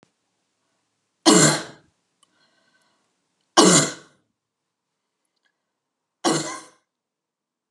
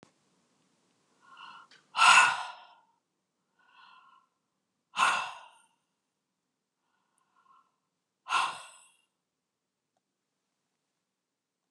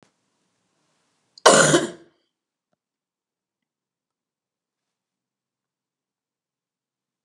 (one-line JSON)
{"three_cough_length": "7.7 s", "three_cough_amplitude": 32318, "three_cough_signal_mean_std_ratio": 0.26, "exhalation_length": "11.7 s", "exhalation_amplitude": 15445, "exhalation_signal_mean_std_ratio": 0.22, "cough_length": "7.2 s", "cough_amplitude": 32768, "cough_signal_mean_std_ratio": 0.18, "survey_phase": "beta (2021-08-13 to 2022-03-07)", "age": "45-64", "gender": "Female", "wearing_mask": "No", "symptom_cough_any": true, "smoker_status": "Never smoked", "respiratory_condition_asthma": false, "respiratory_condition_other": false, "recruitment_source": "REACT", "submission_delay": "2 days", "covid_test_result": "Negative", "covid_test_method": "RT-qPCR", "influenza_a_test_result": "Negative", "influenza_b_test_result": "Negative"}